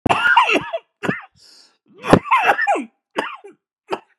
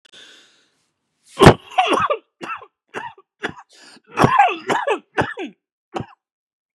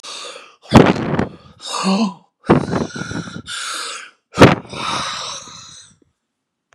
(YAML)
three_cough_length: 4.2 s
three_cough_amplitude: 32768
three_cough_signal_mean_std_ratio: 0.48
cough_length: 6.7 s
cough_amplitude: 32768
cough_signal_mean_std_ratio: 0.34
exhalation_length: 6.7 s
exhalation_amplitude: 32768
exhalation_signal_mean_std_ratio: 0.43
survey_phase: beta (2021-08-13 to 2022-03-07)
age: 45-64
gender: Male
wearing_mask: 'No'
symptom_new_continuous_cough: true
symptom_abdominal_pain: true
symptom_fatigue: true
symptom_fever_high_temperature: true
symptom_headache: true
symptom_onset: 9 days
smoker_status: Never smoked
respiratory_condition_asthma: false
respiratory_condition_other: true
recruitment_source: Test and Trace
submission_delay: 2 days
covid_test_result: Positive
covid_test_method: ePCR